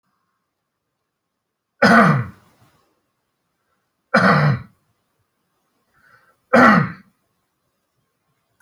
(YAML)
three_cough_length: 8.6 s
three_cough_amplitude: 31971
three_cough_signal_mean_std_ratio: 0.3
survey_phase: beta (2021-08-13 to 2022-03-07)
age: 45-64
gender: Male
wearing_mask: 'No'
symptom_none: true
smoker_status: Never smoked
respiratory_condition_asthma: false
respiratory_condition_other: false
recruitment_source: REACT
submission_delay: 1 day
covid_test_result: Negative
covid_test_method: RT-qPCR